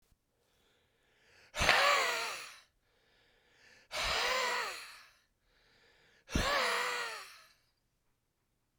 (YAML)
exhalation_length: 8.8 s
exhalation_amplitude: 13601
exhalation_signal_mean_std_ratio: 0.44
survey_phase: beta (2021-08-13 to 2022-03-07)
age: 45-64
gender: Male
wearing_mask: 'No'
symptom_cough_any: true
symptom_sore_throat: true
symptom_abdominal_pain: true
symptom_diarrhoea: true
symptom_fatigue: true
symptom_fever_high_temperature: true
symptom_headache: true
symptom_change_to_sense_of_smell_or_taste: true
symptom_loss_of_taste: true
symptom_onset: 4 days
smoker_status: Ex-smoker
respiratory_condition_asthma: false
respiratory_condition_other: false
recruitment_source: Test and Trace
submission_delay: 2 days
covid_test_result: Positive
covid_test_method: RT-qPCR
covid_ct_value: 12.0
covid_ct_gene: ORF1ab gene